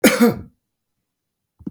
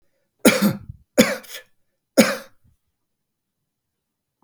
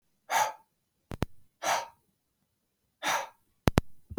{"cough_length": "1.7 s", "cough_amplitude": 32768, "cough_signal_mean_std_ratio": 0.33, "three_cough_length": "4.4 s", "three_cough_amplitude": 32768, "three_cough_signal_mean_std_ratio": 0.28, "exhalation_length": "4.2 s", "exhalation_amplitude": 20525, "exhalation_signal_mean_std_ratio": 0.33, "survey_phase": "beta (2021-08-13 to 2022-03-07)", "age": "65+", "gender": "Male", "wearing_mask": "No", "symptom_none": true, "smoker_status": "Never smoked", "respiratory_condition_asthma": false, "respiratory_condition_other": false, "recruitment_source": "REACT", "submission_delay": "2 days", "covid_test_result": "Negative", "covid_test_method": "RT-qPCR", "influenza_a_test_result": "Negative", "influenza_b_test_result": "Negative"}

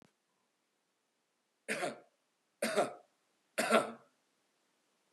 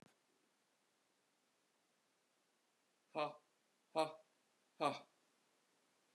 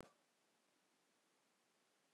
{"three_cough_length": "5.1 s", "three_cough_amplitude": 9862, "three_cough_signal_mean_std_ratio": 0.3, "exhalation_length": "6.1 s", "exhalation_amplitude": 1863, "exhalation_signal_mean_std_ratio": 0.22, "cough_length": "2.1 s", "cough_amplitude": 397, "cough_signal_mean_std_ratio": 0.36, "survey_phase": "beta (2021-08-13 to 2022-03-07)", "age": "45-64", "gender": "Male", "wearing_mask": "No", "symptom_none": true, "smoker_status": "Never smoked", "respiratory_condition_asthma": false, "respiratory_condition_other": false, "recruitment_source": "REACT", "submission_delay": "2 days", "covid_test_result": "Negative", "covid_test_method": "RT-qPCR", "influenza_a_test_result": "Negative", "influenza_b_test_result": "Negative"}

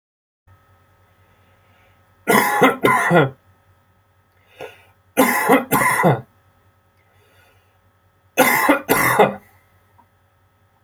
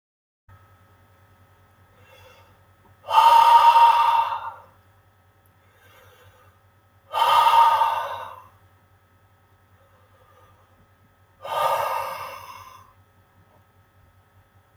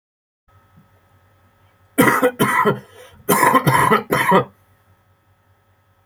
{"three_cough_length": "10.8 s", "three_cough_amplitude": 32767, "three_cough_signal_mean_std_ratio": 0.42, "exhalation_length": "14.8 s", "exhalation_amplitude": 22358, "exhalation_signal_mean_std_ratio": 0.37, "cough_length": "6.1 s", "cough_amplitude": 29459, "cough_signal_mean_std_ratio": 0.45, "survey_phase": "beta (2021-08-13 to 2022-03-07)", "age": "18-44", "gender": "Male", "wearing_mask": "No", "symptom_cough_any": true, "symptom_runny_or_blocked_nose": true, "symptom_abdominal_pain": true, "symptom_diarrhoea": true, "symptom_fatigue": true, "symptom_headache": true, "symptom_change_to_sense_of_smell_or_taste": true, "symptom_other": true, "symptom_onset": "7 days", "smoker_status": "Ex-smoker", "respiratory_condition_asthma": true, "respiratory_condition_other": false, "recruitment_source": "Test and Trace", "submission_delay": "2 days", "covid_test_result": "Positive", "covid_test_method": "RT-qPCR", "covid_ct_value": 18.5, "covid_ct_gene": "ORF1ab gene"}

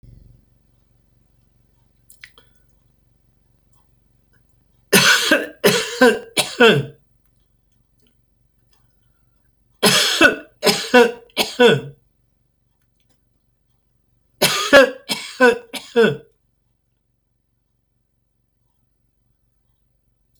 {"three_cough_length": "20.4 s", "three_cough_amplitude": 32768, "three_cough_signal_mean_std_ratio": 0.31, "survey_phase": "beta (2021-08-13 to 2022-03-07)", "age": "65+", "gender": "Male", "wearing_mask": "No", "symptom_none": true, "smoker_status": "Ex-smoker", "respiratory_condition_asthma": false, "respiratory_condition_other": false, "recruitment_source": "REACT", "submission_delay": "1 day", "covid_test_result": "Negative", "covid_test_method": "RT-qPCR", "influenza_a_test_result": "Negative", "influenza_b_test_result": "Negative"}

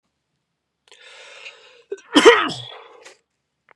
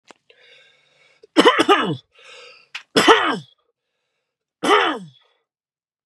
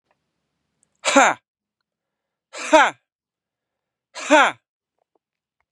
{"cough_length": "3.8 s", "cough_amplitude": 32768, "cough_signal_mean_std_ratio": 0.25, "three_cough_length": "6.1 s", "three_cough_amplitude": 32767, "three_cough_signal_mean_std_ratio": 0.35, "exhalation_length": "5.7 s", "exhalation_amplitude": 32767, "exhalation_signal_mean_std_ratio": 0.26, "survey_phase": "beta (2021-08-13 to 2022-03-07)", "age": "18-44", "gender": "Male", "wearing_mask": "No", "symptom_runny_or_blocked_nose": true, "symptom_headache": true, "symptom_onset": "11 days", "smoker_status": "Ex-smoker", "respiratory_condition_asthma": false, "respiratory_condition_other": false, "recruitment_source": "REACT", "submission_delay": "2 days", "covid_test_result": "Positive", "covid_test_method": "RT-qPCR", "covid_ct_value": 28.0, "covid_ct_gene": "E gene", "influenza_a_test_result": "Negative", "influenza_b_test_result": "Negative"}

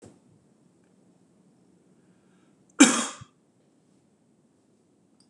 {"cough_length": "5.3 s", "cough_amplitude": 24316, "cough_signal_mean_std_ratio": 0.16, "survey_phase": "beta (2021-08-13 to 2022-03-07)", "age": "45-64", "gender": "Male", "wearing_mask": "No", "symptom_sore_throat": true, "smoker_status": "Never smoked", "respiratory_condition_asthma": false, "respiratory_condition_other": false, "recruitment_source": "REACT", "submission_delay": "8 days", "covid_test_result": "Negative", "covid_test_method": "RT-qPCR", "influenza_a_test_result": "Negative", "influenza_b_test_result": "Negative"}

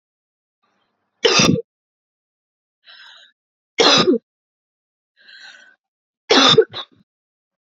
{"three_cough_length": "7.7 s", "three_cough_amplitude": 31225, "three_cough_signal_mean_std_ratio": 0.31, "survey_phase": "beta (2021-08-13 to 2022-03-07)", "age": "18-44", "gender": "Female", "wearing_mask": "No", "symptom_runny_or_blocked_nose": true, "symptom_shortness_of_breath": true, "symptom_fatigue": true, "symptom_fever_high_temperature": true, "symptom_headache": true, "symptom_change_to_sense_of_smell_or_taste": true, "symptom_loss_of_taste": true, "smoker_status": "Never smoked", "respiratory_condition_asthma": false, "respiratory_condition_other": true, "recruitment_source": "Test and Trace", "submission_delay": "2 days", "covid_test_result": "Positive", "covid_test_method": "RT-qPCR", "covid_ct_value": 21.0, "covid_ct_gene": "N gene", "covid_ct_mean": 21.5, "covid_viral_load": "86000 copies/ml", "covid_viral_load_category": "Low viral load (10K-1M copies/ml)"}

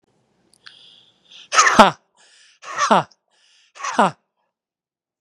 {"exhalation_length": "5.2 s", "exhalation_amplitude": 32768, "exhalation_signal_mean_std_ratio": 0.28, "survey_phase": "beta (2021-08-13 to 2022-03-07)", "age": "45-64", "gender": "Male", "wearing_mask": "No", "symptom_none": true, "smoker_status": "Ex-smoker", "respiratory_condition_asthma": true, "respiratory_condition_other": false, "recruitment_source": "REACT", "submission_delay": "2 days", "covid_test_result": "Negative", "covid_test_method": "RT-qPCR", "influenza_a_test_result": "Negative", "influenza_b_test_result": "Negative"}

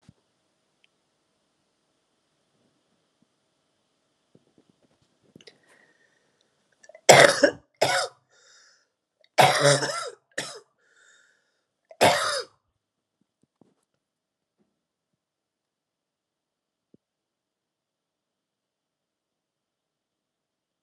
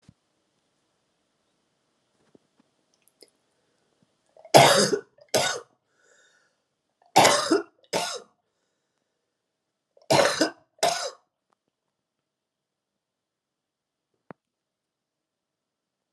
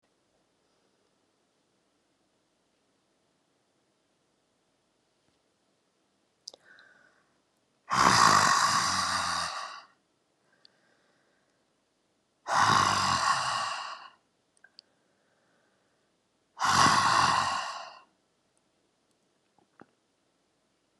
{"cough_length": "20.8 s", "cough_amplitude": 32768, "cough_signal_mean_std_ratio": 0.2, "three_cough_length": "16.1 s", "three_cough_amplitude": 32629, "three_cough_signal_mean_std_ratio": 0.24, "exhalation_length": "21.0 s", "exhalation_amplitude": 14372, "exhalation_signal_mean_std_ratio": 0.35, "survey_phase": "alpha (2021-03-01 to 2021-08-12)", "age": "65+", "gender": "Female", "wearing_mask": "No", "symptom_cough_any": true, "symptom_fatigue": true, "symptom_headache": true, "symptom_change_to_sense_of_smell_or_taste": true, "symptom_onset": "8 days", "smoker_status": "Never smoked", "respiratory_condition_asthma": false, "respiratory_condition_other": false, "recruitment_source": "Test and Trace", "submission_delay": "2 days", "covid_test_result": "Positive", "covid_test_method": "RT-qPCR", "covid_ct_value": 15.5, "covid_ct_gene": "ORF1ab gene", "covid_ct_mean": 15.9, "covid_viral_load": "5900000 copies/ml", "covid_viral_load_category": "High viral load (>1M copies/ml)"}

